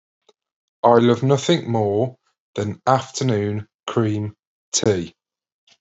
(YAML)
exhalation_length: 5.8 s
exhalation_amplitude: 32416
exhalation_signal_mean_std_ratio: 0.52
survey_phase: beta (2021-08-13 to 2022-03-07)
age: 45-64
gender: Male
wearing_mask: 'No'
symptom_none: true
smoker_status: Current smoker (1 to 10 cigarettes per day)
respiratory_condition_asthma: false
respiratory_condition_other: false
recruitment_source: REACT
submission_delay: 1 day
covid_test_result: Negative
covid_test_method: RT-qPCR